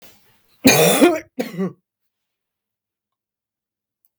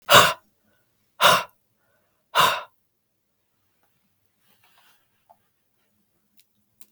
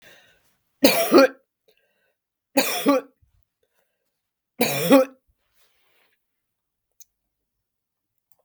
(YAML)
cough_length: 4.2 s
cough_amplitude: 32768
cough_signal_mean_std_ratio: 0.32
exhalation_length: 6.9 s
exhalation_amplitude: 32768
exhalation_signal_mean_std_ratio: 0.23
three_cough_length: 8.4 s
three_cough_amplitude: 32768
three_cough_signal_mean_std_ratio: 0.28
survey_phase: beta (2021-08-13 to 2022-03-07)
age: 65+
gender: Female
wearing_mask: 'No'
symptom_cough_any: true
symptom_runny_or_blocked_nose: true
symptom_sore_throat: true
symptom_onset: 2 days
smoker_status: Never smoked
respiratory_condition_asthma: false
respiratory_condition_other: false
recruitment_source: Test and Trace
submission_delay: 1 day
covid_test_result: Negative
covid_test_method: RT-qPCR